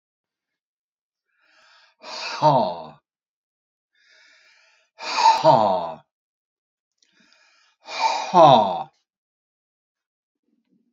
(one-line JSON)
{"exhalation_length": "10.9 s", "exhalation_amplitude": 28542, "exhalation_signal_mean_std_ratio": 0.31, "survey_phase": "beta (2021-08-13 to 2022-03-07)", "age": "65+", "gender": "Male", "wearing_mask": "No", "symptom_cough_any": true, "smoker_status": "Never smoked", "respiratory_condition_asthma": false, "respiratory_condition_other": false, "recruitment_source": "REACT", "submission_delay": "2 days", "covid_test_result": "Negative", "covid_test_method": "RT-qPCR", "influenza_a_test_result": "Negative", "influenza_b_test_result": "Negative"}